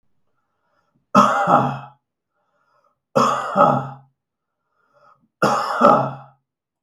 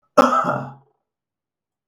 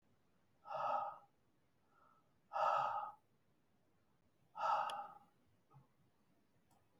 {"three_cough_length": "6.8 s", "three_cough_amplitude": 32768, "three_cough_signal_mean_std_ratio": 0.41, "cough_length": "1.9 s", "cough_amplitude": 32768, "cough_signal_mean_std_ratio": 0.35, "exhalation_length": "7.0 s", "exhalation_amplitude": 1815, "exhalation_signal_mean_std_ratio": 0.4, "survey_phase": "beta (2021-08-13 to 2022-03-07)", "age": "45-64", "gender": "Male", "wearing_mask": "No", "symptom_none": true, "smoker_status": "Ex-smoker", "respiratory_condition_asthma": true, "respiratory_condition_other": false, "recruitment_source": "REACT", "submission_delay": "2 days", "covid_test_result": "Negative", "covid_test_method": "RT-qPCR", "influenza_a_test_result": "Negative", "influenza_b_test_result": "Negative"}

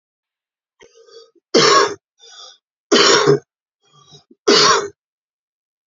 {"three_cough_length": "5.9 s", "three_cough_amplitude": 32767, "three_cough_signal_mean_std_ratio": 0.39, "survey_phase": "beta (2021-08-13 to 2022-03-07)", "age": "65+", "gender": "Male", "wearing_mask": "No", "symptom_cough_any": true, "symptom_runny_or_blocked_nose": true, "smoker_status": "Never smoked", "respiratory_condition_asthma": false, "respiratory_condition_other": false, "recruitment_source": "Test and Trace", "submission_delay": "2 days", "covid_test_result": "Positive", "covid_test_method": "LFT"}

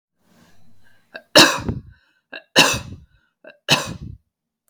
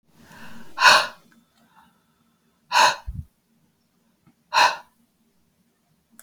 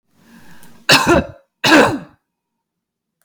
{"three_cough_length": "4.7 s", "three_cough_amplitude": 32768, "three_cough_signal_mean_std_ratio": 0.3, "exhalation_length": "6.2 s", "exhalation_amplitude": 32586, "exhalation_signal_mean_std_ratio": 0.29, "cough_length": "3.2 s", "cough_amplitude": 32768, "cough_signal_mean_std_ratio": 0.39, "survey_phase": "beta (2021-08-13 to 2022-03-07)", "age": "45-64", "gender": "Female", "wearing_mask": "No", "symptom_none": true, "smoker_status": "Never smoked", "respiratory_condition_asthma": false, "respiratory_condition_other": false, "recruitment_source": "REACT", "submission_delay": "3 days", "covid_test_result": "Negative", "covid_test_method": "RT-qPCR", "influenza_a_test_result": "Negative", "influenza_b_test_result": "Negative"}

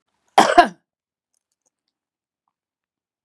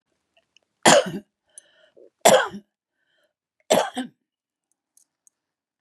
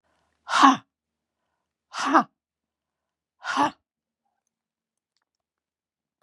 {"cough_length": "3.2 s", "cough_amplitude": 32767, "cough_signal_mean_std_ratio": 0.2, "three_cough_length": "5.8 s", "three_cough_amplitude": 32351, "three_cough_signal_mean_std_ratio": 0.26, "exhalation_length": "6.2 s", "exhalation_amplitude": 29853, "exhalation_signal_mean_std_ratio": 0.24, "survey_phase": "beta (2021-08-13 to 2022-03-07)", "age": "65+", "gender": "Female", "wearing_mask": "No", "symptom_none": true, "symptom_onset": "3 days", "smoker_status": "Ex-smoker", "respiratory_condition_asthma": true, "respiratory_condition_other": true, "recruitment_source": "REACT", "submission_delay": "1 day", "covid_test_result": "Negative", "covid_test_method": "RT-qPCR", "influenza_a_test_result": "Negative", "influenza_b_test_result": "Negative"}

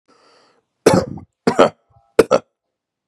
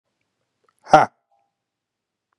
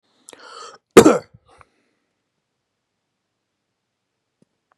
{"three_cough_length": "3.1 s", "three_cough_amplitude": 32768, "three_cough_signal_mean_std_ratio": 0.3, "exhalation_length": "2.4 s", "exhalation_amplitude": 32767, "exhalation_signal_mean_std_ratio": 0.17, "cough_length": "4.8 s", "cough_amplitude": 32768, "cough_signal_mean_std_ratio": 0.16, "survey_phase": "beta (2021-08-13 to 2022-03-07)", "age": "18-44", "gender": "Male", "wearing_mask": "No", "symptom_cough_any": true, "symptom_runny_or_blocked_nose": true, "symptom_sore_throat": true, "symptom_onset": "2 days", "smoker_status": "Current smoker (e-cigarettes or vapes only)", "respiratory_condition_asthma": false, "respiratory_condition_other": false, "recruitment_source": "Test and Trace", "submission_delay": "1 day", "covid_test_result": "Positive", "covid_test_method": "RT-qPCR", "covid_ct_value": 17.7, "covid_ct_gene": "ORF1ab gene", "covid_ct_mean": 18.1, "covid_viral_load": "1100000 copies/ml", "covid_viral_load_category": "High viral load (>1M copies/ml)"}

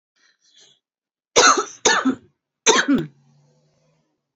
{"three_cough_length": "4.4 s", "three_cough_amplitude": 30367, "three_cough_signal_mean_std_ratio": 0.36, "survey_phase": "beta (2021-08-13 to 2022-03-07)", "age": "45-64", "gender": "Female", "wearing_mask": "No", "symptom_cough_any": true, "symptom_new_continuous_cough": true, "symptom_runny_or_blocked_nose": true, "symptom_shortness_of_breath": true, "symptom_sore_throat": true, "symptom_abdominal_pain": true, "symptom_fatigue": true, "symptom_fever_high_temperature": true, "symptom_headache": true, "symptom_change_to_sense_of_smell_or_taste": true, "symptom_loss_of_taste": true, "symptom_other": true, "symptom_onset": "3 days", "smoker_status": "Never smoked", "respiratory_condition_asthma": false, "respiratory_condition_other": true, "recruitment_source": "Test and Trace", "submission_delay": "2 days", "covid_test_result": "Positive", "covid_test_method": "RT-qPCR", "covid_ct_value": 17.4, "covid_ct_gene": "ORF1ab gene", "covid_ct_mean": 17.9, "covid_viral_load": "1400000 copies/ml", "covid_viral_load_category": "High viral load (>1M copies/ml)"}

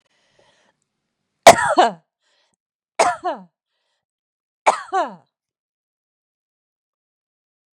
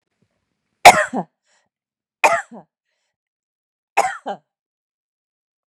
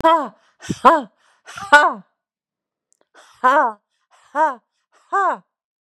{"three_cough_length": "7.8 s", "three_cough_amplitude": 32768, "three_cough_signal_mean_std_ratio": 0.22, "cough_length": "5.7 s", "cough_amplitude": 32768, "cough_signal_mean_std_ratio": 0.21, "exhalation_length": "5.8 s", "exhalation_amplitude": 32768, "exhalation_signal_mean_std_ratio": 0.37, "survey_phase": "beta (2021-08-13 to 2022-03-07)", "age": "65+", "gender": "Female", "wearing_mask": "No", "symptom_none": true, "smoker_status": "Never smoked", "respiratory_condition_asthma": false, "respiratory_condition_other": false, "recruitment_source": "REACT", "submission_delay": "2 days", "covid_test_result": "Negative", "covid_test_method": "RT-qPCR", "influenza_a_test_result": "Negative", "influenza_b_test_result": "Negative"}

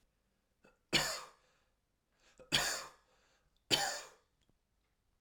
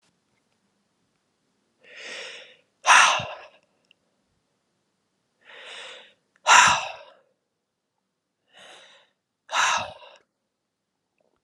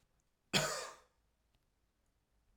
{"three_cough_length": "5.2 s", "three_cough_amplitude": 5068, "three_cough_signal_mean_std_ratio": 0.32, "exhalation_length": "11.4 s", "exhalation_amplitude": 27479, "exhalation_signal_mean_std_ratio": 0.25, "cough_length": "2.6 s", "cough_amplitude": 4228, "cough_signal_mean_std_ratio": 0.28, "survey_phase": "alpha (2021-03-01 to 2021-08-12)", "age": "18-44", "gender": "Male", "wearing_mask": "No", "symptom_none": true, "smoker_status": "Never smoked", "respiratory_condition_asthma": false, "respiratory_condition_other": false, "recruitment_source": "REACT", "submission_delay": "3 days", "covid_test_result": "Negative", "covid_test_method": "RT-qPCR"}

